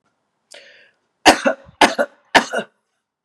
{"three_cough_length": "3.2 s", "three_cough_amplitude": 32768, "three_cough_signal_mean_std_ratio": 0.3, "survey_phase": "beta (2021-08-13 to 2022-03-07)", "age": "45-64", "gender": "Female", "wearing_mask": "No", "symptom_runny_or_blocked_nose": true, "symptom_sore_throat": true, "symptom_headache": true, "symptom_onset": "3 days", "smoker_status": "Current smoker (1 to 10 cigarettes per day)", "respiratory_condition_asthma": false, "respiratory_condition_other": false, "recruitment_source": "Test and Trace", "submission_delay": "2 days", "covid_test_result": "Positive", "covid_test_method": "RT-qPCR", "covid_ct_value": 16.8, "covid_ct_gene": "ORF1ab gene", "covid_ct_mean": 17.1, "covid_viral_load": "2400000 copies/ml", "covid_viral_load_category": "High viral load (>1M copies/ml)"}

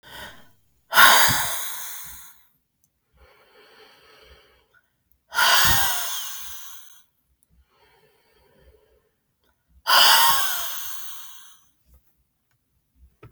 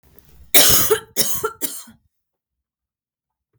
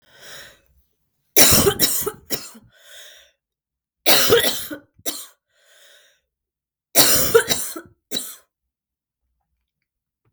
{"exhalation_length": "13.3 s", "exhalation_amplitude": 32766, "exhalation_signal_mean_std_ratio": 0.37, "cough_length": "3.6 s", "cough_amplitude": 32768, "cough_signal_mean_std_ratio": 0.36, "three_cough_length": "10.3 s", "three_cough_amplitude": 32768, "three_cough_signal_mean_std_ratio": 0.36, "survey_phase": "beta (2021-08-13 to 2022-03-07)", "age": "18-44", "gender": "Female", "wearing_mask": "No", "symptom_cough_any": true, "symptom_new_continuous_cough": true, "symptom_runny_or_blocked_nose": true, "symptom_fatigue": true, "symptom_headache": true, "symptom_change_to_sense_of_smell_or_taste": true, "symptom_loss_of_taste": true, "symptom_other": true, "symptom_onset": "3 days", "smoker_status": "Never smoked", "respiratory_condition_asthma": false, "respiratory_condition_other": false, "recruitment_source": "Test and Trace", "submission_delay": "2 days", "covid_test_result": "Positive", "covid_test_method": "RT-qPCR", "covid_ct_value": 18.6, "covid_ct_gene": "ORF1ab gene"}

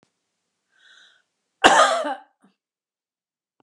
{"cough_length": "3.6 s", "cough_amplitude": 32768, "cough_signal_mean_std_ratio": 0.27, "survey_phase": "beta (2021-08-13 to 2022-03-07)", "age": "45-64", "gender": "Female", "wearing_mask": "No", "symptom_none": true, "smoker_status": "Never smoked", "respiratory_condition_asthma": true, "respiratory_condition_other": false, "recruitment_source": "REACT", "submission_delay": "1 day", "covid_test_result": "Negative", "covid_test_method": "RT-qPCR", "influenza_a_test_result": "Unknown/Void", "influenza_b_test_result": "Unknown/Void"}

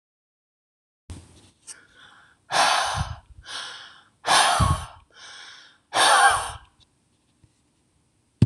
{"exhalation_length": "8.5 s", "exhalation_amplitude": 22716, "exhalation_signal_mean_std_ratio": 0.38, "survey_phase": "beta (2021-08-13 to 2022-03-07)", "age": "65+", "gender": "Female", "wearing_mask": "No", "symptom_runny_or_blocked_nose": true, "smoker_status": "Ex-smoker", "respiratory_condition_asthma": false, "respiratory_condition_other": false, "recruitment_source": "REACT", "submission_delay": "1 day", "covid_test_result": "Negative", "covid_test_method": "RT-qPCR", "influenza_a_test_result": "Negative", "influenza_b_test_result": "Negative"}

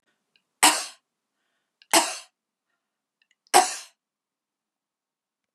{"three_cough_length": "5.5 s", "three_cough_amplitude": 28368, "three_cough_signal_mean_std_ratio": 0.23, "survey_phase": "beta (2021-08-13 to 2022-03-07)", "age": "45-64", "gender": "Female", "wearing_mask": "No", "symptom_cough_any": true, "symptom_shortness_of_breath": true, "symptom_diarrhoea": true, "smoker_status": "Ex-smoker", "respiratory_condition_asthma": false, "respiratory_condition_other": true, "recruitment_source": "REACT", "submission_delay": "0 days", "covid_test_result": "Negative", "covid_test_method": "RT-qPCR", "influenza_a_test_result": "Negative", "influenza_b_test_result": "Negative"}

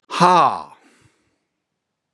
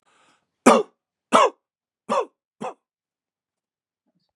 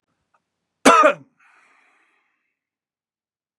{"exhalation_length": "2.1 s", "exhalation_amplitude": 30880, "exhalation_signal_mean_std_ratio": 0.34, "three_cough_length": "4.4 s", "three_cough_amplitude": 32019, "three_cough_signal_mean_std_ratio": 0.25, "cough_length": "3.6 s", "cough_amplitude": 32767, "cough_signal_mean_std_ratio": 0.23, "survey_phase": "beta (2021-08-13 to 2022-03-07)", "age": "45-64", "gender": "Male", "wearing_mask": "No", "symptom_fatigue": true, "symptom_onset": "3 days", "smoker_status": "Never smoked", "respiratory_condition_asthma": false, "respiratory_condition_other": false, "recruitment_source": "Test and Trace", "submission_delay": "1 day", "covid_test_result": "Positive", "covid_test_method": "ePCR"}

